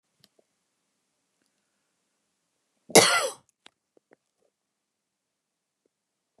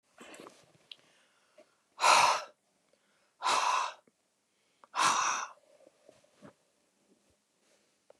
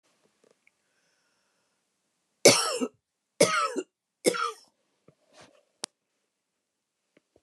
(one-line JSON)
{"cough_length": "6.4 s", "cough_amplitude": 29815, "cough_signal_mean_std_ratio": 0.16, "exhalation_length": "8.2 s", "exhalation_amplitude": 10219, "exhalation_signal_mean_std_ratio": 0.33, "three_cough_length": "7.4 s", "three_cough_amplitude": 24050, "three_cough_signal_mean_std_ratio": 0.24, "survey_phase": "beta (2021-08-13 to 2022-03-07)", "age": "65+", "gender": "Female", "wearing_mask": "No", "symptom_none": true, "smoker_status": "Never smoked", "respiratory_condition_asthma": true, "respiratory_condition_other": false, "recruitment_source": "REACT", "submission_delay": "2 days", "covid_test_result": "Negative", "covid_test_method": "RT-qPCR", "influenza_a_test_result": "Negative", "influenza_b_test_result": "Negative"}